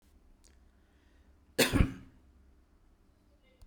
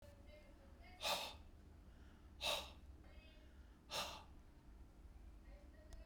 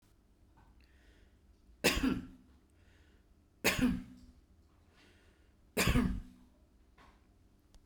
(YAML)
cough_length: 3.7 s
cough_amplitude: 10905
cough_signal_mean_std_ratio: 0.24
exhalation_length: 6.1 s
exhalation_amplitude: 1167
exhalation_signal_mean_std_ratio: 0.59
three_cough_length: 7.9 s
three_cough_amplitude: 6756
three_cough_signal_mean_std_ratio: 0.34
survey_phase: beta (2021-08-13 to 2022-03-07)
age: 65+
gender: Male
wearing_mask: 'No'
symptom_none: true
smoker_status: Ex-smoker
respiratory_condition_asthma: false
respiratory_condition_other: false
recruitment_source: REACT
submission_delay: 2 days
covid_test_result: Negative
covid_test_method: RT-qPCR